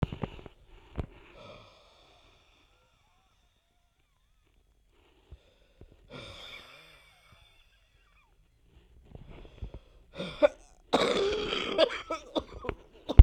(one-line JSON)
{"exhalation_length": "13.2 s", "exhalation_amplitude": 32768, "exhalation_signal_mean_std_ratio": 0.2, "survey_phase": "beta (2021-08-13 to 2022-03-07)", "age": "18-44", "gender": "Female", "wearing_mask": "No", "symptom_cough_any": true, "symptom_runny_or_blocked_nose": true, "symptom_sore_throat": true, "symptom_abdominal_pain": true, "symptom_fatigue": true, "symptom_headache": true, "symptom_change_to_sense_of_smell_or_taste": true, "symptom_loss_of_taste": true, "symptom_onset": "3 days", "smoker_status": "Current smoker (e-cigarettes or vapes only)", "respiratory_condition_asthma": false, "respiratory_condition_other": false, "recruitment_source": "Test and Trace", "submission_delay": "2 days", "covid_test_result": "Positive", "covid_test_method": "RT-qPCR", "covid_ct_value": 19.5, "covid_ct_gene": "N gene"}